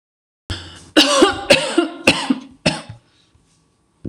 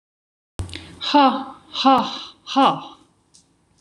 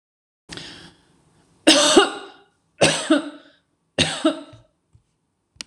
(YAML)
cough_length: 4.1 s
cough_amplitude: 26028
cough_signal_mean_std_ratio: 0.43
exhalation_length: 3.8 s
exhalation_amplitude: 24080
exhalation_signal_mean_std_ratio: 0.43
three_cough_length: 5.7 s
three_cough_amplitude: 26028
three_cough_signal_mean_std_ratio: 0.35
survey_phase: beta (2021-08-13 to 2022-03-07)
age: 45-64
gender: Female
wearing_mask: 'No'
symptom_sore_throat: true
symptom_onset: 12 days
smoker_status: Never smoked
respiratory_condition_asthma: false
respiratory_condition_other: false
recruitment_source: REACT
submission_delay: 5 days
covid_test_result: Negative
covid_test_method: RT-qPCR
influenza_a_test_result: Unknown/Void
influenza_b_test_result: Unknown/Void